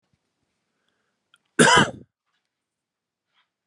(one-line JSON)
{"cough_length": "3.7 s", "cough_amplitude": 26700, "cough_signal_mean_std_ratio": 0.22, "survey_phase": "beta (2021-08-13 to 2022-03-07)", "age": "45-64", "gender": "Male", "wearing_mask": "No", "symptom_none": true, "smoker_status": "Never smoked", "respiratory_condition_asthma": false, "respiratory_condition_other": false, "recruitment_source": "REACT", "submission_delay": "1 day", "covid_test_result": "Negative", "covid_test_method": "RT-qPCR"}